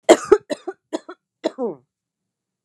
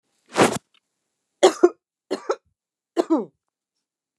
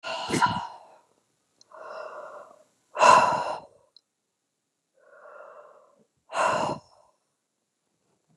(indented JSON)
{
  "cough_length": "2.6 s",
  "cough_amplitude": 29204,
  "cough_signal_mean_std_ratio": 0.26,
  "three_cough_length": "4.2 s",
  "three_cough_amplitude": 28598,
  "three_cough_signal_mean_std_ratio": 0.28,
  "exhalation_length": "8.4 s",
  "exhalation_amplitude": 22575,
  "exhalation_signal_mean_std_ratio": 0.32,
  "survey_phase": "beta (2021-08-13 to 2022-03-07)",
  "age": "45-64",
  "gender": "Female",
  "wearing_mask": "No",
  "symptom_cough_any": true,
  "symptom_sore_throat": true,
  "symptom_headache": true,
  "smoker_status": "Ex-smoker",
  "respiratory_condition_asthma": false,
  "respiratory_condition_other": false,
  "recruitment_source": "Test and Trace",
  "submission_delay": "1 day",
  "covid_test_result": "Negative",
  "covid_test_method": "RT-qPCR"
}